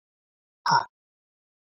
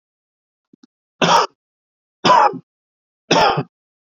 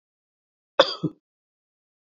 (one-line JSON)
{"exhalation_length": "1.7 s", "exhalation_amplitude": 13488, "exhalation_signal_mean_std_ratio": 0.25, "three_cough_length": "4.2 s", "three_cough_amplitude": 27912, "three_cough_signal_mean_std_ratio": 0.36, "cough_length": "2.0 s", "cough_amplitude": 27518, "cough_signal_mean_std_ratio": 0.18, "survey_phase": "beta (2021-08-13 to 2022-03-07)", "age": "45-64", "gender": "Male", "wearing_mask": "No", "symptom_cough_any": true, "symptom_runny_or_blocked_nose": true, "symptom_headache": true, "symptom_change_to_sense_of_smell_or_taste": true, "symptom_loss_of_taste": true, "symptom_other": true, "symptom_onset": "3 days", "smoker_status": "Ex-smoker", "respiratory_condition_asthma": false, "respiratory_condition_other": false, "recruitment_source": "Test and Trace", "submission_delay": "1 day", "covid_test_result": "Positive", "covid_test_method": "RT-qPCR", "covid_ct_value": 15.8, "covid_ct_gene": "ORF1ab gene", "covid_ct_mean": 16.1, "covid_viral_load": "5200000 copies/ml", "covid_viral_load_category": "High viral load (>1M copies/ml)"}